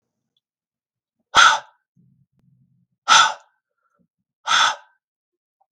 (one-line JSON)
{"exhalation_length": "5.7 s", "exhalation_amplitude": 32768, "exhalation_signal_mean_std_ratio": 0.27, "survey_phase": "beta (2021-08-13 to 2022-03-07)", "age": "45-64", "gender": "Male", "wearing_mask": "No", "symptom_none": true, "smoker_status": "Never smoked", "respiratory_condition_asthma": false, "respiratory_condition_other": false, "recruitment_source": "REACT", "submission_delay": "2 days", "covid_test_result": "Negative", "covid_test_method": "RT-qPCR", "influenza_a_test_result": "Negative", "influenza_b_test_result": "Negative"}